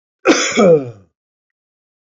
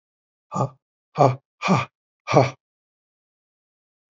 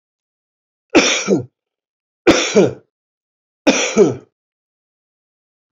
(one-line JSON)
{"cough_length": "2.0 s", "cough_amplitude": 28269, "cough_signal_mean_std_ratio": 0.43, "exhalation_length": "4.1 s", "exhalation_amplitude": 26499, "exhalation_signal_mean_std_ratio": 0.31, "three_cough_length": "5.7 s", "three_cough_amplitude": 31468, "three_cough_signal_mean_std_ratio": 0.36, "survey_phase": "beta (2021-08-13 to 2022-03-07)", "age": "65+", "gender": "Male", "wearing_mask": "No", "symptom_none": true, "smoker_status": "Ex-smoker", "respiratory_condition_asthma": false, "respiratory_condition_other": false, "recruitment_source": "REACT", "submission_delay": "6 days", "covid_test_result": "Negative", "covid_test_method": "RT-qPCR", "influenza_a_test_result": "Negative", "influenza_b_test_result": "Negative"}